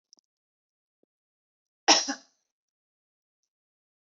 cough_length: 4.2 s
cough_amplitude: 17803
cough_signal_mean_std_ratio: 0.16
survey_phase: beta (2021-08-13 to 2022-03-07)
age: 18-44
gender: Female
wearing_mask: 'No'
symptom_none: true
smoker_status: Never smoked
respiratory_condition_asthma: false
respiratory_condition_other: false
recruitment_source: REACT
submission_delay: 1 day
covid_test_result: Negative
covid_test_method: RT-qPCR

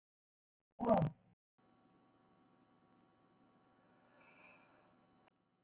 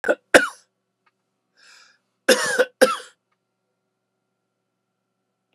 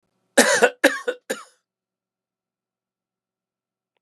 exhalation_length: 5.6 s
exhalation_amplitude: 3140
exhalation_signal_mean_std_ratio: 0.21
cough_length: 5.5 s
cough_amplitude: 32768
cough_signal_mean_std_ratio: 0.24
three_cough_length: 4.0 s
three_cough_amplitude: 32444
three_cough_signal_mean_std_ratio: 0.26
survey_phase: alpha (2021-03-01 to 2021-08-12)
age: 65+
gender: Male
wearing_mask: 'No'
symptom_none: true
smoker_status: Ex-smoker
respiratory_condition_asthma: true
respiratory_condition_other: false
recruitment_source: REACT
submission_delay: 2 days
covid_test_result: Negative
covid_test_method: RT-qPCR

